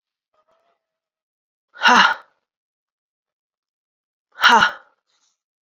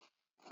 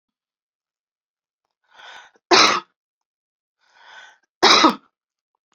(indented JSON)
{
  "exhalation_length": "5.6 s",
  "exhalation_amplitude": 29781,
  "exhalation_signal_mean_std_ratio": 0.26,
  "cough_length": "0.5 s",
  "cough_amplitude": 498,
  "cough_signal_mean_std_ratio": 0.37,
  "three_cough_length": "5.5 s",
  "three_cough_amplitude": 32768,
  "three_cough_signal_mean_std_ratio": 0.26,
  "survey_phase": "beta (2021-08-13 to 2022-03-07)",
  "age": "45-64",
  "gender": "Female",
  "wearing_mask": "No",
  "symptom_cough_any": true,
  "symptom_new_continuous_cough": true,
  "symptom_runny_or_blocked_nose": true,
  "symptom_diarrhoea": true,
  "symptom_fever_high_temperature": true,
  "symptom_onset": "3 days",
  "smoker_status": "Never smoked",
  "respiratory_condition_asthma": false,
  "respiratory_condition_other": false,
  "recruitment_source": "Test and Trace",
  "submission_delay": "2 days",
  "covid_test_result": "Positive",
  "covid_test_method": "RT-qPCR",
  "covid_ct_value": 27.6,
  "covid_ct_gene": "ORF1ab gene"
}